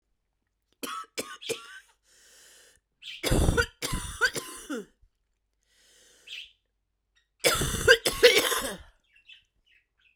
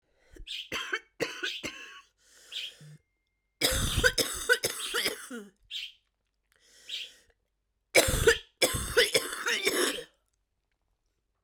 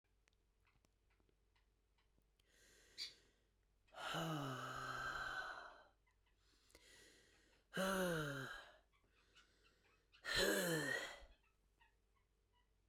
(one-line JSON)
{"cough_length": "10.2 s", "cough_amplitude": 24456, "cough_signal_mean_std_ratio": 0.35, "three_cough_length": "11.4 s", "three_cough_amplitude": 16120, "three_cough_signal_mean_std_ratio": 0.44, "exhalation_length": "12.9 s", "exhalation_amplitude": 1532, "exhalation_signal_mean_std_ratio": 0.44, "survey_phase": "beta (2021-08-13 to 2022-03-07)", "age": "45-64", "gender": "Female", "wearing_mask": "No", "symptom_cough_any": true, "symptom_runny_or_blocked_nose": true, "symptom_shortness_of_breath": true, "symptom_sore_throat": true, "symptom_fatigue": true, "symptom_headache": true, "symptom_change_to_sense_of_smell_or_taste": true, "symptom_loss_of_taste": true, "smoker_status": "Ex-smoker", "respiratory_condition_asthma": false, "respiratory_condition_other": false, "recruitment_source": "Test and Trace", "submission_delay": "1 day", "covid_test_result": "Positive", "covid_test_method": "RT-qPCR", "covid_ct_value": 17.5, "covid_ct_gene": "ORF1ab gene", "covid_ct_mean": 18.7, "covid_viral_load": "730000 copies/ml", "covid_viral_load_category": "Low viral load (10K-1M copies/ml)"}